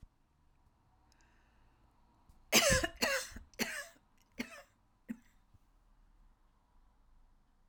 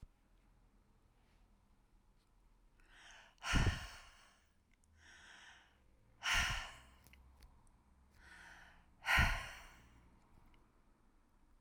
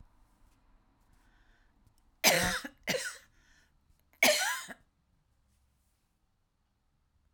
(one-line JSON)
{"cough_length": "7.7 s", "cough_amplitude": 8158, "cough_signal_mean_std_ratio": 0.28, "exhalation_length": "11.6 s", "exhalation_amplitude": 3793, "exhalation_signal_mean_std_ratio": 0.31, "three_cough_length": "7.3 s", "three_cough_amplitude": 10316, "three_cough_signal_mean_std_ratio": 0.28, "survey_phase": "alpha (2021-03-01 to 2021-08-12)", "age": "65+", "gender": "Female", "wearing_mask": "No", "symptom_headache": true, "smoker_status": "Never smoked", "respiratory_condition_asthma": false, "respiratory_condition_other": false, "recruitment_source": "REACT", "submission_delay": "1 day", "covid_test_result": "Negative", "covid_test_method": "RT-qPCR"}